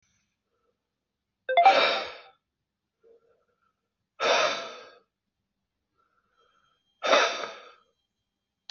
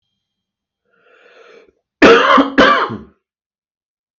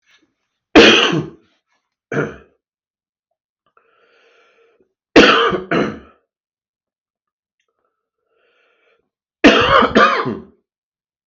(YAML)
exhalation_length: 8.7 s
exhalation_amplitude: 16009
exhalation_signal_mean_std_ratio: 0.3
cough_length: 4.2 s
cough_amplitude: 32768
cough_signal_mean_std_ratio: 0.36
three_cough_length: 11.3 s
three_cough_amplitude: 32768
three_cough_signal_mean_std_ratio: 0.33
survey_phase: beta (2021-08-13 to 2022-03-07)
age: 45-64
gender: Male
wearing_mask: 'No'
symptom_cough_any: true
symptom_runny_or_blocked_nose: true
smoker_status: Never smoked
respiratory_condition_asthma: false
respiratory_condition_other: false
recruitment_source: REACT
submission_delay: 6 days
covid_test_result: Negative
covid_test_method: RT-qPCR
influenza_a_test_result: Negative
influenza_b_test_result: Negative